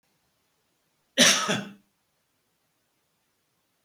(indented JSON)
{
  "cough_length": "3.8 s",
  "cough_amplitude": 18967,
  "cough_signal_mean_std_ratio": 0.24,
  "survey_phase": "beta (2021-08-13 to 2022-03-07)",
  "age": "65+",
  "gender": "Male",
  "wearing_mask": "No",
  "symptom_none": true,
  "smoker_status": "Ex-smoker",
  "respiratory_condition_asthma": false,
  "respiratory_condition_other": false,
  "recruitment_source": "REACT",
  "submission_delay": "2 days",
  "covid_test_result": "Negative",
  "covid_test_method": "RT-qPCR",
  "influenza_a_test_result": "Negative",
  "influenza_b_test_result": "Negative"
}